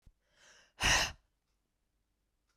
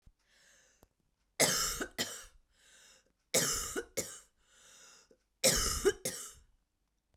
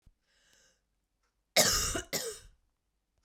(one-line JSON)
{"exhalation_length": "2.6 s", "exhalation_amplitude": 5790, "exhalation_signal_mean_std_ratio": 0.28, "three_cough_length": "7.2 s", "three_cough_amplitude": 8340, "three_cough_signal_mean_std_ratio": 0.39, "cough_length": "3.2 s", "cough_amplitude": 10892, "cough_signal_mean_std_ratio": 0.33, "survey_phase": "beta (2021-08-13 to 2022-03-07)", "age": "45-64", "gender": "Female", "wearing_mask": "No", "symptom_cough_any": true, "symptom_runny_or_blocked_nose": true, "smoker_status": "Ex-smoker", "respiratory_condition_asthma": false, "respiratory_condition_other": false, "recruitment_source": "REACT", "submission_delay": "0 days", "covid_test_result": "Negative", "covid_test_method": "RT-qPCR"}